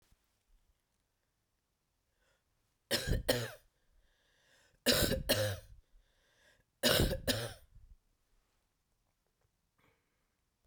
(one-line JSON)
{"three_cough_length": "10.7 s", "three_cough_amplitude": 6797, "three_cough_signal_mean_std_ratio": 0.32, "survey_phase": "beta (2021-08-13 to 2022-03-07)", "age": "45-64", "gender": "Female", "wearing_mask": "No", "symptom_cough_any": true, "symptom_runny_or_blocked_nose": true, "symptom_sore_throat": true, "symptom_fatigue": true, "smoker_status": "Ex-smoker", "respiratory_condition_asthma": false, "respiratory_condition_other": false, "recruitment_source": "Test and Trace", "submission_delay": "2 days", "covid_test_result": "Positive", "covid_test_method": "RT-qPCR", "covid_ct_value": 31.8, "covid_ct_gene": "ORF1ab gene", "covid_ct_mean": 32.2, "covid_viral_load": "28 copies/ml", "covid_viral_load_category": "Minimal viral load (< 10K copies/ml)"}